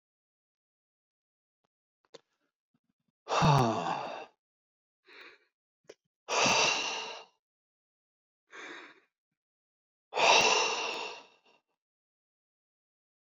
exhalation_length: 13.3 s
exhalation_amplitude: 8893
exhalation_signal_mean_std_ratio: 0.34
survey_phase: beta (2021-08-13 to 2022-03-07)
age: 65+
gender: Male
wearing_mask: 'No'
symptom_none: true
smoker_status: Ex-smoker
respiratory_condition_asthma: false
respiratory_condition_other: true
recruitment_source: REACT
submission_delay: 4 days
covid_test_result: Negative
covid_test_method: RT-qPCR
influenza_a_test_result: Unknown/Void
influenza_b_test_result: Unknown/Void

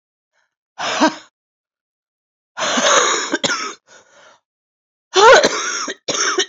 exhalation_length: 6.5 s
exhalation_amplitude: 31132
exhalation_signal_mean_std_ratio: 0.45
survey_phase: beta (2021-08-13 to 2022-03-07)
age: 45-64
gender: Female
wearing_mask: 'No'
symptom_new_continuous_cough: true
symptom_runny_or_blocked_nose: true
symptom_sore_throat: true
symptom_diarrhoea: true
symptom_fatigue: true
symptom_fever_high_temperature: true
symptom_headache: true
symptom_change_to_sense_of_smell_or_taste: true
symptom_onset: 4 days
smoker_status: Never smoked
respiratory_condition_asthma: true
respiratory_condition_other: false
recruitment_source: Test and Trace
submission_delay: 1 day
covid_test_result: Positive
covid_test_method: ePCR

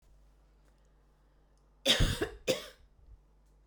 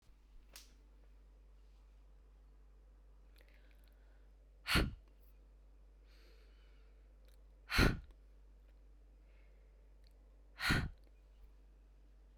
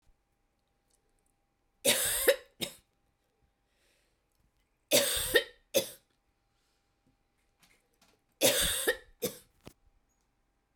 cough_length: 3.7 s
cough_amplitude: 7800
cough_signal_mean_std_ratio: 0.32
exhalation_length: 12.4 s
exhalation_amplitude: 4846
exhalation_signal_mean_std_ratio: 0.31
three_cough_length: 10.8 s
three_cough_amplitude: 11002
three_cough_signal_mean_std_ratio: 0.31
survey_phase: beta (2021-08-13 to 2022-03-07)
age: 45-64
gender: Female
wearing_mask: 'No'
symptom_runny_or_blocked_nose: true
symptom_other: true
smoker_status: Ex-smoker
respiratory_condition_asthma: false
respiratory_condition_other: false
recruitment_source: Test and Trace
submission_delay: 2 days
covid_test_result: Positive
covid_test_method: RT-qPCR
covid_ct_value: 15.7
covid_ct_gene: ORF1ab gene
covid_ct_mean: 15.9
covid_viral_load: 6000000 copies/ml
covid_viral_load_category: High viral load (>1M copies/ml)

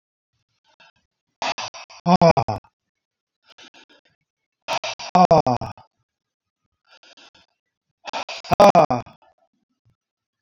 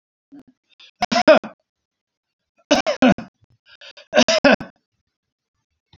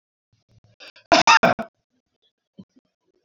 exhalation_length: 10.4 s
exhalation_amplitude: 27084
exhalation_signal_mean_std_ratio: 0.27
three_cough_length: 6.0 s
three_cough_amplitude: 28397
three_cough_signal_mean_std_ratio: 0.3
cough_length: 3.2 s
cough_amplitude: 32768
cough_signal_mean_std_ratio: 0.26
survey_phase: beta (2021-08-13 to 2022-03-07)
age: 65+
gender: Male
wearing_mask: 'No'
symptom_cough_any: true
smoker_status: Ex-smoker
respiratory_condition_asthma: true
respiratory_condition_other: false
recruitment_source: REACT
submission_delay: 4 days
covid_test_result: Negative
covid_test_method: RT-qPCR
influenza_a_test_result: Negative
influenza_b_test_result: Negative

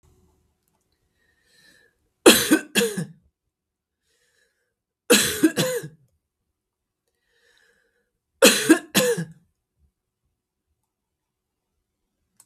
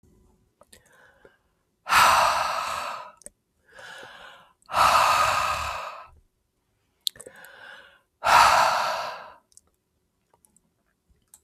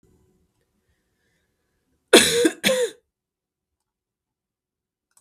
three_cough_length: 12.5 s
three_cough_amplitude: 32768
three_cough_signal_mean_std_ratio: 0.26
exhalation_length: 11.4 s
exhalation_amplitude: 23800
exhalation_signal_mean_std_ratio: 0.41
cough_length: 5.2 s
cough_amplitude: 32768
cough_signal_mean_std_ratio: 0.25
survey_phase: beta (2021-08-13 to 2022-03-07)
age: 45-64
gender: Female
wearing_mask: 'No'
symptom_none: true
smoker_status: Never smoked
respiratory_condition_asthma: false
respiratory_condition_other: false
recruitment_source: REACT
submission_delay: 1 day
covid_test_result: Negative
covid_test_method: RT-qPCR
influenza_a_test_result: Negative
influenza_b_test_result: Negative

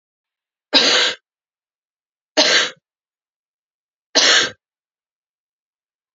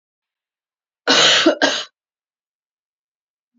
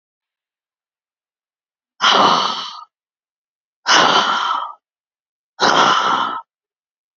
three_cough_length: 6.1 s
three_cough_amplitude: 30836
three_cough_signal_mean_std_ratio: 0.33
cough_length: 3.6 s
cough_amplitude: 30735
cough_signal_mean_std_ratio: 0.35
exhalation_length: 7.2 s
exhalation_amplitude: 32594
exhalation_signal_mean_std_ratio: 0.45
survey_phase: beta (2021-08-13 to 2022-03-07)
age: 45-64
gender: Female
wearing_mask: 'No'
symptom_cough_any: true
symptom_runny_or_blocked_nose: true
symptom_sore_throat: true
symptom_abdominal_pain: true
symptom_fatigue: true
symptom_headache: true
symptom_onset: 3 days
smoker_status: Never smoked
respiratory_condition_asthma: false
respiratory_condition_other: false
recruitment_source: Test and Trace
submission_delay: 2 days
covid_test_result: Negative
covid_test_method: ePCR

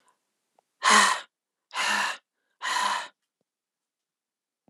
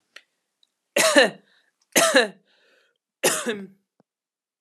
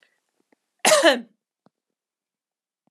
exhalation_length: 4.7 s
exhalation_amplitude: 17448
exhalation_signal_mean_std_ratio: 0.37
three_cough_length: 4.6 s
three_cough_amplitude: 32062
three_cough_signal_mean_std_ratio: 0.34
cough_length: 2.9 s
cough_amplitude: 29583
cough_signal_mean_std_ratio: 0.25
survey_phase: alpha (2021-03-01 to 2021-08-12)
age: 18-44
gender: Female
wearing_mask: 'No'
symptom_none: true
smoker_status: Never smoked
respiratory_condition_asthma: false
respiratory_condition_other: false
recruitment_source: REACT
submission_delay: 1 day
covid_test_result: Negative
covid_test_method: RT-qPCR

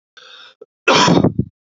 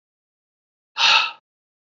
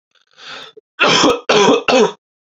cough_length: 1.7 s
cough_amplitude: 32768
cough_signal_mean_std_ratio: 0.46
exhalation_length: 2.0 s
exhalation_amplitude: 29941
exhalation_signal_mean_std_ratio: 0.31
three_cough_length: 2.5 s
three_cough_amplitude: 32767
three_cough_signal_mean_std_ratio: 0.56
survey_phase: beta (2021-08-13 to 2022-03-07)
age: 18-44
gender: Male
wearing_mask: 'No'
symptom_cough_any: true
symptom_new_continuous_cough: true
symptom_runny_or_blocked_nose: true
symptom_sore_throat: true
symptom_onset: 3 days
smoker_status: Never smoked
respiratory_condition_asthma: false
respiratory_condition_other: false
recruitment_source: Test and Trace
submission_delay: 2 days
covid_test_result: Positive
covid_test_method: LAMP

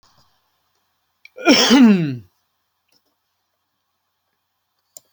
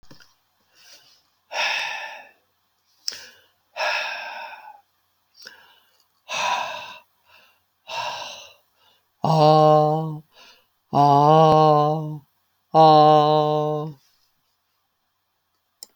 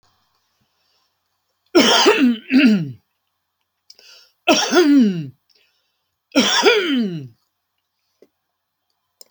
cough_length: 5.1 s
cough_amplitude: 32345
cough_signal_mean_std_ratio: 0.3
exhalation_length: 16.0 s
exhalation_amplitude: 24921
exhalation_signal_mean_std_ratio: 0.42
three_cough_length: 9.3 s
three_cough_amplitude: 31290
three_cough_signal_mean_std_ratio: 0.44
survey_phase: beta (2021-08-13 to 2022-03-07)
age: 65+
gender: Male
wearing_mask: 'No'
symptom_none: true
smoker_status: Never smoked
respiratory_condition_asthma: false
respiratory_condition_other: false
recruitment_source: REACT
submission_delay: 29 days
covid_test_result: Negative
covid_test_method: RT-qPCR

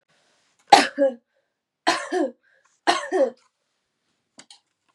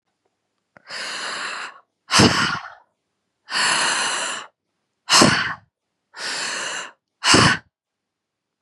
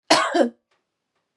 three_cough_length: 4.9 s
three_cough_amplitude: 32768
three_cough_signal_mean_std_ratio: 0.31
exhalation_length: 8.6 s
exhalation_amplitude: 32767
exhalation_signal_mean_std_ratio: 0.45
cough_length: 1.4 s
cough_amplitude: 27918
cough_signal_mean_std_ratio: 0.41
survey_phase: beta (2021-08-13 to 2022-03-07)
age: 18-44
gender: Female
wearing_mask: 'No'
symptom_cough_any: true
symptom_runny_or_blocked_nose: true
symptom_sore_throat: true
symptom_fatigue: true
symptom_headache: true
symptom_onset: 4 days
smoker_status: Never smoked
respiratory_condition_asthma: false
respiratory_condition_other: false
recruitment_source: Test and Trace
submission_delay: 2 days
covid_test_result: Positive
covid_test_method: RT-qPCR
covid_ct_value: 21.0
covid_ct_gene: N gene
covid_ct_mean: 21.0
covid_viral_load: 130000 copies/ml
covid_viral_load_category: Low viral load (10K-1M copies/ml)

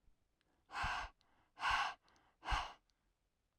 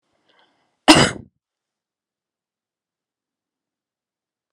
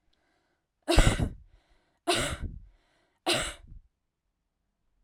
exhalation_length: 3.6 s
exhalation_amplitude: 1846
exhalation_signal_mean_std_ratio: 0.42
cough_length: 4.5 s
cough_amplitude: 32768
cough_signal_mean_std_ratio: 0.17
three_cough_length: 5.0 s
three_cough_amplitude: 17253
three_cough_signal_mean_std_ratio: 0.32
survey_phase: alpha (2021-03-01 to 2021-08-12)
age: 18-44
gender: Female
wearing_mask: 'No'
symptom_none: true
smoker_status: Ex-smoker
respiratory_condition_asthma: false
respiratory_condition_other: false
recruitment_source: REACT
submission_delay: 2 days
covid_test_result: Negative
covid_test_method: RT-qPCR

